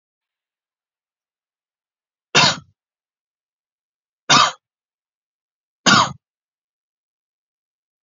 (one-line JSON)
{"three_cough_length": "8.0 s", "three_cough_amplitude": 32767, "three_cough_signal_mean_std_ratio": 0.22, "survey_phase": "beta (2021-08-13 to 2022-03-07)", "age": "45-64", "gender": "Male", "wearing_mask": "No", "symptom_none": true, "symptom_onset": "2 days", "smoker_status": "Never smoked", "respiratory_condition_asthma": false, "respiratory_condition_other": false, "recruitment_source": "REACT", "submission_delay": "0 days", "covid_test_result": "Negative", "covid_test_method": "RT-qPCR"}